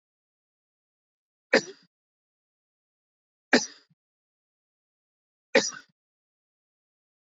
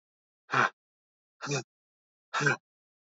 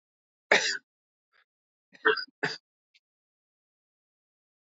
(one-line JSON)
{"three_cough_length": "7.3 s", "three_cough_amplitude": 17096, "three_cough_signal_mean_std_ratio": 0.15, "exhalation_length": "3.2 s", "exhalation_amplitude": 8593, "exhalation_signal_mean_std_ratio": 0.32, "cough_length": "4.8 s", "cough_amplitude": 16041, "cough_signal_mean_std_ratio": 0.23, "survey_phase": "beta (2021-08-13 to 2022-03-07)", "age": "18-44", "gender": "Male", "wearing_mask": "No", "symptom_none": true, "smoker_status": "Never smoked", "respiratory_condition_asthma": false, "respiratory_condition_other": false, "recruitment_source": "Test and Trace", "submission_delay": "0 days", "covid_test_result": "Negative", "covid_test_method": "LFT"}